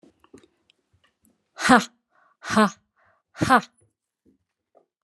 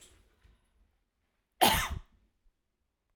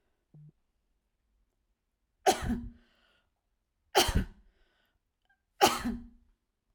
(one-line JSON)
{"exhalation_length": "5.0 s", "exhalation_amplitude": 30536, "exhalation_signal_mean_std_ratio": 0.24, "cough_length": "3.2 s", "cough_amplitude": 14018, "cough_signal_mean_std_ratio": 0.25, "three_cough_length": "6.7 s", "three_cough_amplitude": 14306, "three_cough_signal_mean_std_ratio": 0.27, "survey_phase": "alpha (2021-03-01 to 2021-08-12)", "age": "45-64", "gender": "Female", "wearing_mask": "No", "symptom_none": true, "smoker_status": "Never smoked", "respiratory_condition_asthma": false, "respiratory_condition_other": false, "recruitment_source": "REACT", "submission_delay": "1 day", "covid_test_result": "Negative", "covid_test_method": "RT-qPCR"}